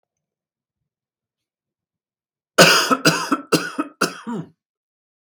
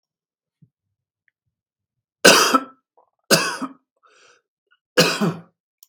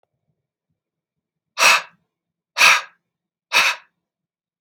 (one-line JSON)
{"cough_length": "5.3 s", "cough_amplitude": 32768, "cough_signal_mean_std_ratio": 0.32, "three_cough_length": "5.9 s", "three_cough_amplitude": 32768, "three_cough_signal_mean_std_ratio": 0.29, "exhalation_length": "4.6 s", "exhalation_amplitude": 32766, "exhalation_signal_mean_std_ratio": 0.3, "survey_phase": "beta (2021-08-13 to 2022-03-07)", "age": "18-44", "gender": "Male", "wearing_mask": "No", "symptom_cough_any": true, "symptom_runny_or_blocked_nose": true, "symptom_sore_throat": true, "symptom_fatigue": true, "symptom_fever_high_temperature": true, "symptom_headache": true, "symptom_onset": "3 days", "smoker_status": "Never smoked", "respiratory_condition_asthma": false, "respiratory_condition_other": false, "recruitment_source": "Test and Trace", "submission_delay": "2 days", "covid_test_result": "Positive", "covid_test_method": "RT-qPCR", "covid_ct_value": 26.0, "covid_ct_gene": "ORF1ab gene", "covid_ct_mean": 26.7, "covid_viral_load": "1800 copies/ml", "covid_viral_load_category": "Minimal viral load (< 10K copies/ml)"}